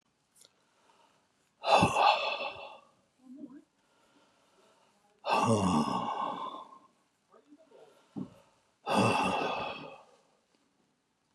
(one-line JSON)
{"exhalation_length": "11.3 s", "exhalation_amplitude": 10019, "exhalation_signal_mean_std_ratio": 0.42, "survey_phase": "beta (2021-08-13 to 2022-03-07)", "age": "65+", "gender": "Male", "wearing_mask": "No", "symptom_none": true, "smoker_status": "Ex-smoker", "respiratory_condition_asthma": false, "respiratory_condition_other": false, "recruitment_source": "REACT", "submission_delay": "1 day", "covid_test_result": "Negative", "covid_test_method": "RT-qPCR"}